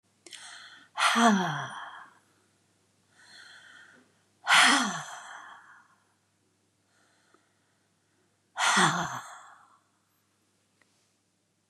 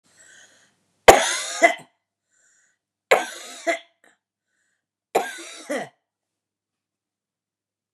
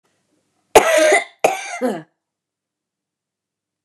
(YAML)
exhalation_length: 11.7 s
exhalation_amplitude: 13369
exhalation_signal_mean_std_ratio: 0.33
three_cough_length: 7.9 s
three_cough_amplitude: 32768
three_cough_signal_mean_std_ratio: 0.23
cough_length: 3.8 s
cough_amplitude: 32768
cough_signal_mean_std_ratio: 0.35
survey_phase: beta (2021-08-13 to 2022-03-07)
age: 45-64
gender: Female
wearing_mask: 'No'
symptom_none: true
smoker_status: Never smoked
respiratory_condition_asthma: false
respiratory_condition_other: false
recruitment_source: REACT
submission_delay: 2 days
covid_test_result: Negative
covid_test_method: RT-qPCR
influenza_a_test_result: Negative
influenza_b_test_result: Negative